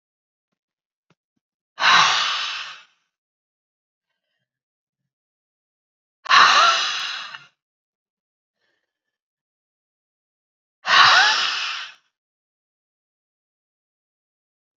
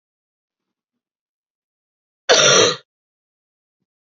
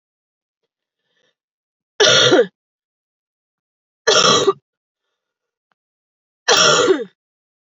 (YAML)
exhalation_length: 14.8 s
exhalation_amplitude: 29525
exhalation_signal_mean_std_ratio: 0.31
cough_length: 4.1 s
cough_amplitude: 32768
cough_signal_mean_std_ratio: 0.27
three_cough_length: 7.7 s
three_cough_amplitude: 32768
three_cough_signal_mean_std_ratio: 0.36
survey_phase: beta (2021-08-13 to 2022-03-07)
age: 18-44
gender: Female
wearing_mask: 'No'
symptom_cough_any: true
symptom_runny_or_blocked_nose: true
symptom_fever_high_temperature: true
symptom_headache: true
symptom_other: true
symptom_onset: 2 days
smoker_status: Ex-smoker
respiratory_condition_asthma: false
respiratory_condition_other: false
recruitment_source: Test and Trace
submission_delay: 1 day
covid_test_result: Positive
covid_test_method: RT-qPCR
covid_ct_value: 28.4
covid_ct_gene: ORF1ab gene
covid_ct_mean: 28.5
covid_viral_load: 440 copies/ml
covid_viral_load_category: Minimal viral load (< 10K copies/ml)